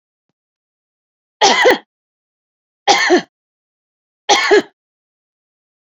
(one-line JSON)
{"three_cough_length": "5.9 s", "three_cough_amplitude": 30565, "three_cough_signal_mean_std_ratio": 0.34, "survey_phase": "beta (2021-08-13 to 2022-03-07)", "age": "45-64", "gender": "Female", "wearing_mask": "No", "symptom_none": true, "smoker_status": "Never smoked", "respiratory_condition_asthma": false, "respiratory_condition_other": false, "recruitment_source": "REACT", "submission_delay": "1 day", "covid_test_result": "Negative", "covid_test_method": "RT-qPCR", "influenza_a_test_result": "Negative", "influenza_b_test_result": "Negative"}